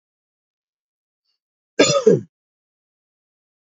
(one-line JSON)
{"cough_length": "3.8 s", "cough_amplitude": 32767, "cough_signal_mean_std_ratio": 0.23, "survey_phase": "beta (2021-08-13 to 2022-03-07)", "age": "45-64", "gender": "Male", "wearing_mask": "No", "symptom_cough_any": true, "smoker_status": "Never smoked", "respiratory_condition_asthma": false, "respiratory_condition_other": false, "recruitment_source": "Test and Trace", "submission_delay": "4 days", "covid_test_result": "Negative", "covid_test_method": "RT-qPCR"}